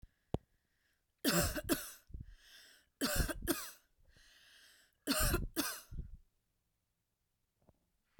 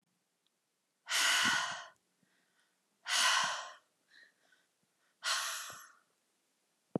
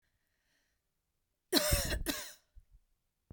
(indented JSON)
{
  "three_cough_length": "8.2 s",
  "three_cough_amplitude": 3822,
  "three_cough_signal_mean_std_ratio": 0.4,
  "exhalation_length": "7.0 s",
  "exhalation_amplitude": 4344,
  "exhalation_signal_mean_std_ratio": 0.4,
  "cough_length": "3.3 s",
  "cough_amplitude": 9008,
  "cough_signal_mean_std_ratio": 0.35,
  "survey_phase": "beta (2021-08-13 to 2022-03-07)",
  "age": "45-64",
  "gender": "Female",
  "wearing_mask": "No",
  "symptom_none": true,
  "smoker_status": "Ex-smoker",
  "respiratory_condition_asthma": false,
  "respiratory_condition_other": false,
  "recruitment_source": "REACT",
  "submission_delay": "1 day",
  "covid_test_result": "Negative",
  "covid_test_method": "RT-qPCR"
}